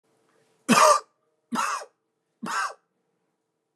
{"three_cough_length": "3.8 s", "three_cough_amplitude": 21771, "three_cough_signal_mean_std_ratio": 0.33, "survey_phase": "beta (2021-08-13 to 2022-03-07)", "age": "45-64", "gender": "Male", "wearing_mask": "No", "symptom_none": true, "smoker_status": "Ex-smoker", "respiratory_condition_asthma": false, "respiratory_condition_other": false, "recruitment_source": "REACT", "submission_delay": "1 day", "covid_test_result": "Negative", "covid_test_method": "RT-qPCR", "influenza_a_test_result": "Negative", "influenza_b_test_result": "Negative"}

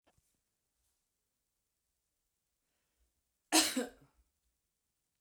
{"cough_length": "5.2 s", "cough_amplitude": 6745, "cough_signal_mean_std_ratio": 0.18, "survey_phase": "beta (2021-08-13 to 2022-03-07)", "age": "45-64", "gender": "Female", "wearing_mask": "No", "symptom_runny_or_blocked_nose": true, "symptom_sore_throat": true, "symptom_onset": "13 days", "smoker_status": "Ex-smoker", "respiratory_condition_asthma": false, "respiratory_condition_other": false, "recruitment_source": "REACT", "submission_delay": "1 day", "covid_test_result": "Negative", "covid_test_method": "RT-qPCR"}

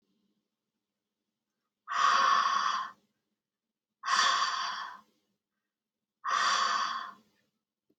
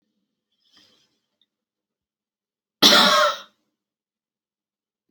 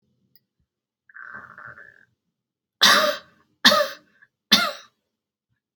{"exhalation_length": "8.0 s", "exhalation_amplitude": 7224, "exhalation_signal_mean_std_ratio": 0.48, "cough_length": "5.1 s", "cough_amplitude": 28781, "cough_signal_mean_std_ratio": 0.25, "three_cough_length": "5.8 s", "three_cough_amplitude": 30981, "three_cough_signal_mean_std_ratio": 0.29, "survey_phase": "alpha (2021-03-01 to 2021-08-12)", "age": "18-44", "gender": "Female", "wearing_mask": "No", "symptom_none": true, "smoker_status": "Never smoked", "respiratory_condition_asthma": false, "respiratory_condition_other": false, "recruitment_source": "REACT", "submission_delay": "4 days", "covid_test_result": "Negative", "covid_test_method": "RT-qPCR"}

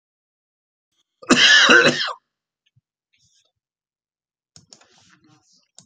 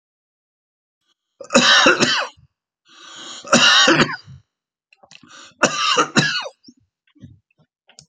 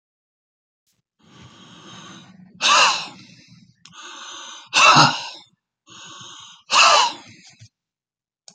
{"cough_length": "5.9 s", "cough_amplitude": 28704, "cough_signal_mean_std_ratio": 0.29, "three_cough_length": "8.1 s", "three_cough_amplitude": 32767, "three_cough_signal_mean_std_ratio": 0.41, "exhalation_length": "8.5 s", "exhalation_amplitude": 31669, "exhalation_signal_mean_std_ratio": 0.34, "survey_phase": "beta (2021-08-13 to 2022-03-07)", "age": "65+", "gender": "Male", "wearing_mask": "No", "symptom_none": true, "smoker_status": "Never smoked", "respiratory_condition_asthma": false, "respiratory_condition_other": false, "recruitment_source": "REACT", "submission_delay": "5 days", "covid_test_result": "Negative", "covid_test_method": "RT-qPCR", "influenza_a_test_result": "Negative", "influenza_b_test_result": "Negative"}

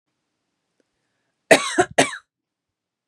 {"cough_length": "3.1 s", "cough_amplitude": 32767, "cough_signal_mean_std_ratio": 0.24, "survey_phase": "beta (2021-08-13 to 2022-03-07)", "age": "18-44", "gender": "Male", "wearing_mask": "No", "symptom_cough_any": true, "symptom_headache": true, "symptom_onset": "3 days", "smoker_status": "Never smoked", "respiratory_condition_asthma": false, "respiratory_condition_other": false, "recruitment_source": "Test and Trace", "submission_delay": "1 day", "covid_test_result": "Negative", "covid_test_method": "ePCR"}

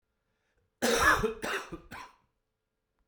{"cough_length": "3.1 s", "cough_amplitude": 8566, "cough_signal_mean_std_ratio": 0.4, "survey_phase": "alpha (2021-03-01 to 2021-08-12)", "age": "45-64", "gender": "Male", "wearing_mask": "No", "symptom_cough_any": true, "symptom_fatigue": true, "symptom_fever_high_temperature": true, "symptom_headache": true, "symptom_change_to_sense_of_smell_or_taste": true, "symptom_loss_of_taste": true, "smoker_status": "Never smoked", "respiratory_condition_asthma": false, "respiratory_condition_other": false, "recruitment_source": "Test and Trace", "submission_delay": "1 day", "covid_test_result": "Positive", "covid_test_method": "RT-qPCR"}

